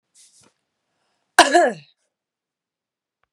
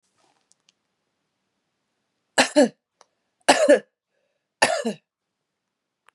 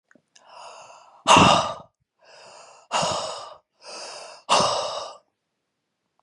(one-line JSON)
{"cough_length": "3.3 s", "cough_amplitude": 32768, "cough_signal_mean_std_ratio": 0.23, "three_cough_length": "6.1 s", "three_cough_amplitude": 32456, "three_cough_signal_mean_std_ratio": 0.26, "exhalation_length": "6.2 s", "exhalation_amplitude": 30488, "exhalation_signal_mean_std_ratio": 0.36, "survey_phase": "beta (2021-08-13 to 2022-03-07)", "age": "18-44", "gender": "Female", "wearing_mask": "No", "symptom_fever_high_temperature": true, "smoker_status": "Ex-smoker", "respiratory_condition_asthma": true, "respiratory_condition_other": false, "recruitment_source": "Test and Trace", "submission_delay": "2 days", "covid_test_result": "Positive", "covid_test_method": "RT-qPCR", "covid_ct_value": 19.0, "covid_ct_gene": "ORF1ab gene", "covid_ct_mean": 19.7, "covid_viral_load": "350000 copies/ml", "covid_viral_load_category": "Low viral load (10K-1M copies/ml)"}